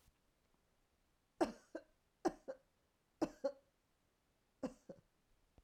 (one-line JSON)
{"three_cough_length": "5.6 s", "three_cough_amplitude": 2507, "three_cough_signal_mean_std_ratio": 0.23, "survey_phase": "alpha (2021-03-01 to 2021-08-12)", "age": "45-64", "gender": "Female", "wearing_mask": "No", "symptom_headache": true, "symptom_onset": "4 days", "smoker_status": "Never smoked", "respiratory_condition_asthma": false, "respiratory_condition_other": false, "recruitment_source": "REACT", "submission_delay": "3 days", "covid_test_result": "Negative", "covid_test_method": "RT-qPCR"}